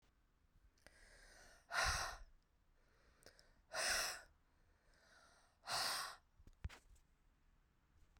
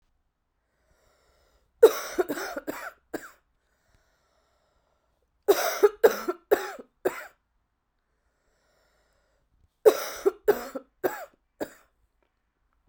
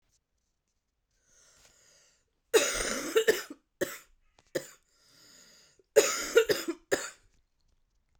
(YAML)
exhalation_length: 8.2 s
exhalation_amplitude: 1522
exhalation_signal_mean_std_ratio: 0.39
three_cough_length: 12.9 s
three_cough_amplitude: 24653
three_cough_signal_mean_std_ratio: 0.25
cough_length: 8.2 s
cough_amplitude: 14190
cough_signal_mean_std_ratio: 0.31
survey_phase: beta (2021-08-13 to 2022-03-07)
age: 18-44
gender: Female
wearing_mask: 'No'
symptom_cough_any: true
symptom_new_continuous_cough: true
symptom_shortness_of_breath: true
symptom_abdominal_pain: true
symptom_diarrhoea: true
symptom_fatigue: true
symptom_headache: true
symptom_change_to_sense_of_smell_or_taste: true
symptom_other: true
smoker_status: Ex-smoker
respiratory_condition_asthma: true
respiratory_condition_other: false
recruitment_source: Test and Trace
submission_delay: 3 days
covid_test_result: Positive
covid_test_method: RT-qPCR
covid_ct_value: 32.1
covid_ct_gene: N gene
covid_ct_mean: 33.2
covid_viral_load: 13 copies/ml
covid_viral_load_category: Minimal viral load (< 10K copies/ml)